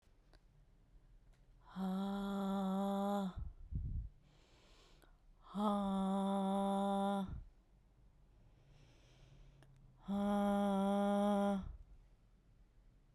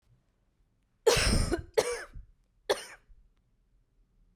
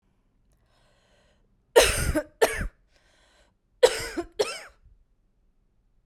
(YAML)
exhalation_length: 13.1 s
exhalation_amplitude: 1882
exhalation_signal_mean_std_ratio: 0.62
three_cough_length: 4.4 s
three_cough_amplitude: 9532
three_cough_signal_mean_std_ratio: 0.35
cough_length: 6.1 s
cough_amplitude: 25145
cough_signal_mean_std_ratio: 0.29
survey_phase: beta (2021-08-13 to 2022-03-07)
age: 18-44
gender: Female
wearing_mask: 'No'
symptom_new_continuous_cough: true
symptom_runny_or_blocked_nose: true
symptom_sore_throat: true
smoker_status: Never smoked
respiratory_condition_asthma: false
respiratory_condition_other: false
recruitment_source: Test and Trace
submission_delay: -1 day
covid_test_result: Negative
covid_test_method: LFT